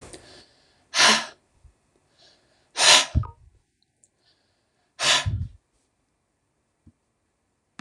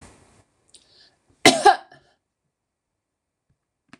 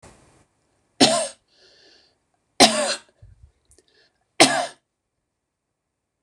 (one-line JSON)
{"exhalation_length": "7.8 s", "exhalation_amplitude": 25960, "exhalation_signal_mean_std_ratio": 0.28, "cough_length": "4.0 s", "cough_amplitude": 26028, "cough_signal_mean_std_ratio": 0.19, "three_cough_length": "6.2 s", "three_cough_amplitude": 26028, "three_cough_signal_mean_std_ratio": 0.26, "survey_phase": "beta (2021-08-13 to 2022-03-07)", "age": "45-64", "gender": "Female", "wearing_mask": "No", "symptom_fatigue": true, "symptom_headache": true, "smoker_status": "Ex-smoker", "respiratory_condition_asthma": false, "respiratory_condition_other": false, "recruitment_source": "REACT", "submission_delay": "0 days", "covid_test_result": "Negative", "covid_test_method": "RT-qPCR", "influenza_a_test_result": "Negative", "influenza_b_test_result": "Negative"}